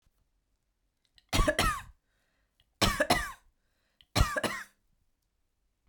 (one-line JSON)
{"three_cough_length": "5.9 s", "three_cough_amplitude": 9427, "three_cough_signal_mean_std_ratio": 0.34, "survey_phase": "beta (2021-08-13 to 2022-03-07)", "age": "45-64", "gender": "Female", "wearing_mask": "No", "symptom_none": true, "smoker_status": "Never smoked", "respiratory_condition_asthma": false, "respiratory_condition_other": false, "recruitment_source": "REACT", "submission_delay": "2 days", "covid_test_result": "Negative", "covid_test_method": "RT-qPCR", "influenza_a_test_result": "Unknown/Void", "influenza_b_test_result": "Unknown/Void"}